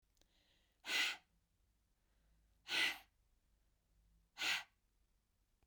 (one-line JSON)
{"exhalation_length": "5.7 s", "exhalation_amplitude": 1621, "exhalation_signal_mean_std_ratio": 0.31, "survey_phase": "beta (2021-08-13 to 2022-03-07)", "age": "45-64", "gender": "Female", "wearing_mask": "No", "symptom_none": true, "smoker_status": "Never smoked", "respiratory_condition_asthma": false, "respiratory_condition_other": false, "recruitment_source": "Test and Trace", "submission_delay": "1 day", "covid_test_result": "Negative", "covid_test_method": "RT-qPCR"}